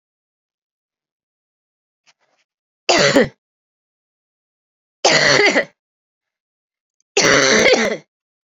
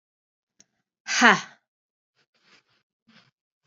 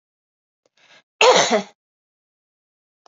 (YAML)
three_cough_length: 8.4 s
three_cough_amplitude: 32768
three_cough_signal_mean_std_ratio: 0.36
exhalation_length: 3.7 s
exhalation_amplitude: 29941
exhalation_signal_mean_std_ratio: 0.2
cough_length: 3.1 s
cough_amplitude: 28581
cough_signal_mean_std_ratio: 0.28
survey_phase: beta (2021-08-13 to 2022-03-07)
age: 45-64
gender: Female
wearing_mask: 'No'
symptom_cough_any: true
symptom_runny_or_blocked_nose: true
symptom_sore_throat: true
symptom_fatigue: true
symptom_headache: true
symptom_change_to_sense_of_smell_or_taste: true
symptom_loss_of_taste: true
symptom_onset: 5 days
smoker_status: Never smoked
respiratory_condition_asthma: false
respiratory_condition_other: false
recruitment_source: Test and Trace
submission_delay: 1 day
covid_test_result: Positive
covid_test_method: RT-qPCR
covid_ct_value: 19.7
covid_ct_gene: ORF1ab gene
covid_ct_mean: 20.3
covid_viral_load: 230000 copies/ml
covid_viral_load_category: Low viral load (10K-1M copies/ml)